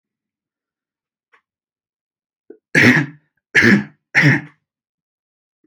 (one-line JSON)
{"three_cough_length": "5.7 s", "three_cough_amplitude": 30698, "three_cough_signal_mean_std_ratio": 0.31, "survey_phase": "alpha (2021-03-01 to 2021-08-12)", "age": "18-44", "gender": "Male", "wearing_mask": "No", "symptom_none": true, "smoker_status": "Never smoked", "respiratory_condition_asthma": false, "respiratory_condition_other": false, "recruitment_source": "REACT", "submission_delay": "1 day", "covid_test_result": "Negative", "covid_test_method": "RT-qPCR", "covid_ct_value": 42.0, "covid_ct_gene": "E gene"}